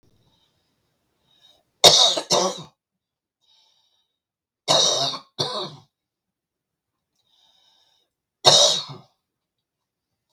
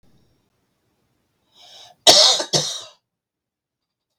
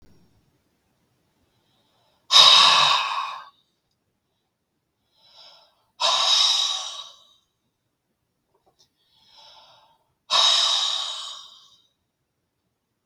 {"three_cough_length": "10.3 s", "three_cough_amplitude": 32768, "three_cough_signal_mean_std_ratio": 0.29, "cough_length": "4.2 s", "cough_amplitude": 32768, "cough_signal_mean_std_ratio": 0.27, "exhalation_length": "13.1 s", "exhalation_amplitude": 32766, "exhalation_signal_mean_std_ratio": 0.35, "survey_phase": "beta (2021-08-13 to 2022-03-07)", "age": "45-64", "gender": "Male", "wearing_mask": "No", "symptom_none": true, "smoker_status": "Never smoked", "respiratory_condition_asthma": true, "respiratory_condition_other": false, "recruitment_source": "REACT", "submission_delay": "6 days", "covid_test_result": "Negative", "covid_test_method": "RT-qPCR", "influenza_a_test_result": "Unknown/Void", "influenza_b_test_result": "Unknown/Void"}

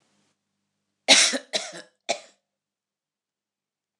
{"cough_length": "4.0 s", "cough_amplitude": 25764, "cough_signal_mean_std_ratio": 0.24, "survey_phase": "beta (2021-08-13 to 2022-03-07)", "age": "65+", "gender": "Female", "wearing_mask": "No", "symptom_none": true, "smoker_status": "Never smoked", "respiratory_condition_asthma": false, "respiratory_condition_other": false, "recruitment_source": "REACT", "submission_delay": "1 day", "covid_test_result": "Negative", "covid_test_method": "RT-qPCR"}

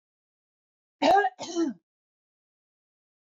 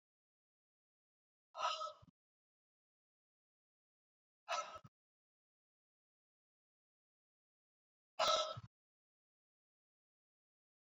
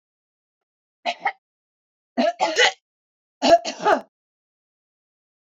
{"cough_length": "3.2 s", "cough_amplitude": 9572, "cough_signal_mean_std_ratio": 0.31, "exhalation_length": "10.9 s", "exhalation_amplitude": 2257, "exhalation_signal_mean_std_ratio": 0.22, "three_cough_length": "5.5 s", "three_cough_amplitude": 23178, "three_cough_signal_mean_std_ratio": 0.31, "survey_phase": "beta (2021-08-13 to 2022-03-07)", "age": "65+", "gender": "Female", "wearing_mask": "No", "symptom_none": true, "smoker_status": "Never smoked", "respiratory_condition_asthma": false, "respiratory_condition_other": false, "recruitment_source": "REACT", "submission_delay": "2 days", "covid_test_result": "Negative", "covid_test_method": "RT-qPCR", "influenza_a_test_result": "Negative", "influenza_b_test_result": "Negative"}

